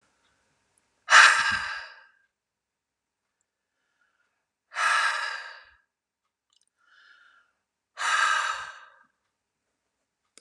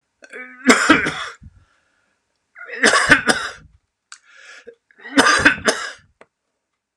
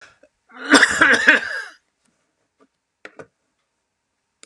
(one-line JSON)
{"exhalation_length": "10.4 s", "exhalation_amplitude": 26706, "exhalation_signal_mean_std_ratio": 0.29, "three_cough_length": "7.0 s", "three_cough_amplitude": 32768, "three_cough_signal_mean_std_ratio": 0.39, "cough_length": "4.5 s", "cough_amplitude": 32768, "cough_signal_mean_std_ratio": 0.32, "survey_phase": "beta (2021-08-13 to 2022-03-07)", "age": "65+", "gender": "Male", "wearing_mask": "No", "symptom_runny_or_blocked_nose": true, "smoker_status": "Ex-smoker", "respiratory_condition_asthma": false, "respiratory_condition_other": false, "recruitment_source": "REACT", "submission_delay": "2 days", "covid_test_result": "Negative", "covid_test_method": "RT-qPCR", "influenza_a_test_result": "Negative", "influenza_b_test_result": "Negative"}